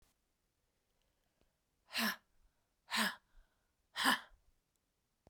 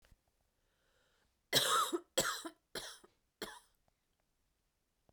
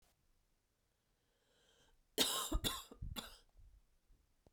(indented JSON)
{
  "exhalation_length": "5.3 s",
  "exhalation_amplitude": 4599,
  "exhalation_signal_mean_std_ratio": 0.28,
  "three_cough_length": "5.1 s",
  "three_cough_amplitude": 5974,
  "three_cough_signal_mean_std_ratio": 0.32,
  "cough_length": "4.5 s",
  "cough_amplitude": 3876,
  "cough_signal_mean_std_ratio": 0.33,
  "survey_phase": "beta (2021-08-13 to 2022-03-07)",
  "age": "18-44",
  "gender": "Female",
  "wearing_mask": "No",
  "symptom_cough_any": true,
  "symptom_runny_or_blocked_nose": true,
  "symptom_diarrhoea": true,
  "symptom_fatigue": true,
  "symptom_headache": true,
  "symptom_onset": "2 days",
  "smoker_status": "Never smoked",
  "respiratory_condition_asthma": true,
  "respiratory_condition_other": false,
  "recruitment_source": "Test and Trace",
  "submission_delay": "1 day",
  "covid_test_result": "Positive",
  "covid_test_method": "RT-qPCR",
  "covid_ct_value": 23.2,
  "covid_ct_gene": "N gene"
}